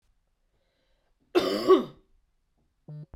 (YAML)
cough_length: 3.2 s
cough_amplitude: 13592
cough_signal_mean_std_ratio: 0.28
survey_phase: beta (2021-08-13 to 2022-03-07)
age: 18-44
gender: Male
wearing_mask: 'No'
symptom_cough_any: true
symptom_sore_throat: true
symptom_fatigue: true
symptom_headache: true
symptom_onset: 5 days
smoker_status: Never smoked
respiratory_condition_asthma: false
respiratory_condition_other: false
recruitment_source: Test and Trace
submission_delay: 2 days
covid_test_result: Positive
covid_test_method: RT-qPCR
covid_ct_value: 12.7
covid_ct_gene: ORF1ab gene